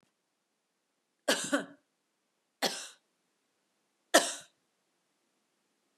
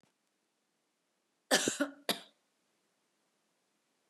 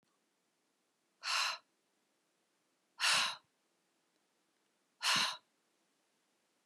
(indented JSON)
{
  "three_cough_length": "6.0 s",
  "three_cough_amplitude": 16273,
  "three_cough_signal_mean_std_ratio": 0.22,
  "cough_length": "4.1 s",
  "cough_amplitude": 7468,
  "cough_signal_mean_std_ratio": 0.23,
  "exhalation_length": "6.7 s",
  "exhalation_amplitude": 4115,
  "exhalation_signal_mean_std_ratio": 0.31,
  "survey_phase": "beta (2021-08-13 to 2022-03-07)",
  "age": "45-64",
  "gender": "Female",
  "wearing_mask": "No",
  "symptom_none": true,
  "smoker_status": "Never smoked",
  "respiratory_condition_asthma": false,
  "respiratory_condition_other": false,
  "recruitment_source": "REACT",
  "submission_delay": "2 days",
  "covid_test_result": "Negative",
  "covid_test_method": "RT-qPCR",
  "influenza_a_test_result": "Negative",
  "influenza_b_test_result": "Negative"
}